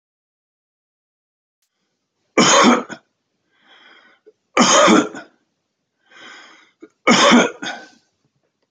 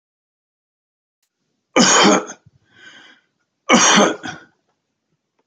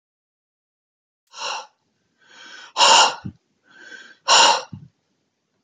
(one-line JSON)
{"three_cough_length": "8.7 s", "three_cough_amplitude": 31674, "three_cough_signal_mean_std_ratio": 0.35, "cough_length": "5.5 s", "cough_amplitude": 29671, "cough_signal_mean_std_ratio": 0.35, "exhalation_length": "5.6 s", "exhalation_amplitude": 28909, "exhalation_signal_mean_std_ratio": 0.32, "survey_phase": "beta (2021-08-13 to 2022-03-07)", "age": "45-64", "gender": "Male", "wearing_mask": "No", "symptom_cough_any": true, "smoker_status": "Never smoked", "respiratory_condition_asthma": false, "respiratory_condition_other": false, "recruitment_source": "REACT", "submission_delay": "1 day", "covid_test_result": "Negative", "covid_test_method": "RT-qPCR"}